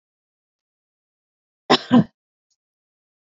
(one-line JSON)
{"cough_length": "3.3 s", "cough_amplitude": 27058, "cough_signal_mean_std_ratio": 0.19, "survey_phase": "beta (2021-08-13 to 2022-03-07)", "age": "18-44", "gender": "Female", "wearing_mask": "No", "symptom_cough_any": true, "symptom_fatigue": true, "symptom_headache": true, "symptom_onset": "12 days", "smoker_status": "Never smoked", "respiratory_condition_asthma": false, "respiratory_condition_other": false, "recruitment_source": "REACT", "submission_delay": "-1 day", "covid_test_result": "Negative", "covid_test_method": "RT-qPCR"}